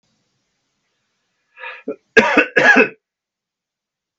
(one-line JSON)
{"cough_length": "4.2 s", "cough_amplitude": 32768, "cough_signal_mean_std_ratio": 0.31, "survey_phase": "beta (2021-08-13 to 2022-03-07)", "age": "65+", "gender": "Male", "wearing_mask": "No", "symptom_none": true, "smoker_status": "Never smoked", "respiratory_condition_asthma": false, "respiratory_condition_other": false, "recruitment_source": "REACT", "submission_delay": "1 day", "covid_test_result": "Negative", "covid_test_method": "RT-qPCR", "influenza_a_test_result": "Negative", "influenza_b_test_result": "Negative"}